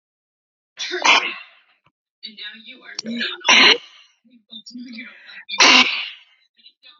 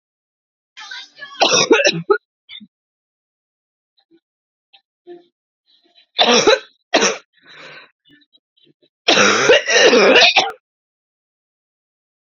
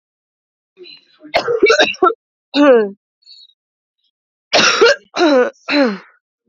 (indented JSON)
{
  "exhalation_length": "7.0 s",
  "exhalation_amplitude": 31346,
  "exhalation_signal_mean_std_ratio": 0.36,
  "three_cough_length": "12.4 s",
  "three_cough_amplitude": 32767,
  "three_cough_signal_mean_std_ratio": 0.38,
  "cough_length": "6.5 s",
  "cough_amplitude": 31185,
  "cough_signal_mean_std_ratio": 0.47,
  "survey_phase": "beta (2021-08-13 to 2022-03-07)",
  "age": "18-44",
  "gender": "Female",
  "wearing_mask": "No",
  "symptom_cough_any": true,
  "symptom_runny_or_blocked_nose": true,
  "symptom_sore_throat": true,
  "symptom_abdominal_pain": true,
  "symptom_fatigue": true,
  "symptom_fever_high_temperature": true,
  "symptom_headache": true,
  "symptom_change_to_sense_of_smell_or_taste": true,
  "symptom_onset": "7 days",
  "smoker_status": "Ex-smoker",
  "respiratory_condition_asthma": false,
  "respiratory_condition_other": false,
  "recruitment_source": "Test and Trace",
  "submission_delay": "2 days",
  "covid_test_result": "Positive",
  "covid_test_method": "RT-qPCR",
  "covid_ct_value": 21.5,
  "covid_ct_gene": "ORF1ab gene",
  "covid_ct_mean": 21.7,
  "covid_viral_load": "78000 copies/ml",
  "covid_viral_load_category": "Low viral load (10K-1M copies/ml)"
}